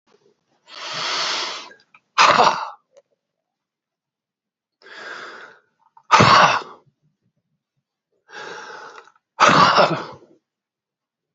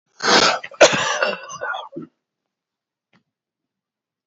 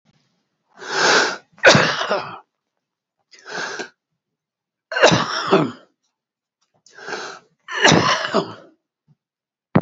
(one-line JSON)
{"exhalation_length": "11.3 s", "exhalation_amplitude": 32768, "exhalation_signal_mean_std_ratio": 0.34, "cough_length": "4.3 s", "cough_amplitude": 29132, "cough_signal_mean_std_ratio": 0.37, "three_cough_length": "9.8 s", "three_cough_amplitude": 32768, "three_cough_signal_mean_std_ratio": 0.4, "survey_phase": "beta (2021-08-13 to 2022-03-07)", "age": "65+", "gender": "Male", "wearing_mask": "No", "symptom_cough_any": true, "symptom_shortness_of_breath": true, "symptom_onset": "12 days", "smoker_status": "Ex-smoker", "respiratory_condition_asthma": false, "respiratory_condition_other": true, "recruitment_source": "REACT", "submission_delay": "1 day", "covid_test_result": "Negative", "covid_test_method": "RT-qPCR", "influenza_a_test_result": "Negative", "influenza_b_test_result": "Negative"}